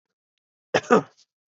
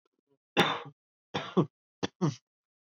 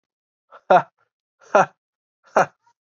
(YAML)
cough_length: 1.5 s
cough_amplitude: 23450
cough_signal_mean_std_ratio: 0.25
three_cough_length: 2.8 s
three_cough_amplitude: 10172
three_cough_signal_mean_std_ratio: 0.33
exhalation_length: 3.0 s
exhalation_amplitude: 27818
exhalation_signal_mean_std_ratio: 0.25
survey_phase: beta (2021-08-13 to 2022-03-07)
age: 18-44
gender: Male
wearing_mask: 'No'
symptom_cough_any: true
symptom_runny_or_blocked_nose: true
symptom_fatigue: true
symptom_headache: true
symptom_loss_of_taste: true
symptom_onset: 2 days
smoker_status: Never smoked
respiratory_condition_asthma: false
respiratory_condition_other: false
recruitment_source: Test and Trace
submission_delay: 1 day
covid_test_result: Positive
covid_test_method: RT-qPCR
covid_ct_value: 23.3
covid_ct_gene: ORF1ab gene